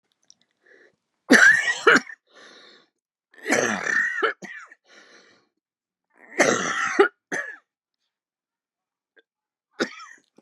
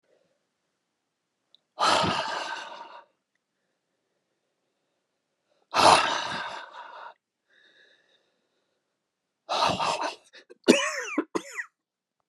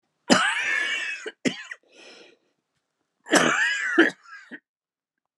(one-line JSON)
{"three_cough_length": "10.4 s", "three_cough_amplitude": 30519, "three_cough_signal_mean_std_ratio": 0.34, "exhalation_length": "12.3 s", "exhalation_amplitude": 26930, "exhalation_signal_mean_std_ratio": 0.34, "cough_length": "5.4 s", "cough_amplitude": 27649, "cough_signal_mean_std_ratio": 0.45, "survey_phase": "beta (2021-08-13 to 2022-03-07)", "age": "45-64", "gender": "Male", "wearing_mask": "No", "symptom_new_continuous_cough": true, "symptom_runny_or_blocked_nose": true, "symptom_sore_throat": true, "symptom_fatigue": true, "symptom_fever_high_temperature": true, "symptom_headache": true, "symptom_other": true, "smoker_status": "Never smoked", "respiratory_condition_asthma": false, "respiratory_condition_other": false, "recruitment_source": "Test and Trace", "submission_delay": "2 days", "covid_test_result": "Positive", "covid_test_method": "RT-qPCR", "covid_ct_value": 12.7, "covid_ct_gene": "ORF1ab gene", "covid_ct_mean": 13.0, "covid_viral_load": "53000000 copies/ml", "covid_viral_load_category": "High viral load (>1M copies/ml)"}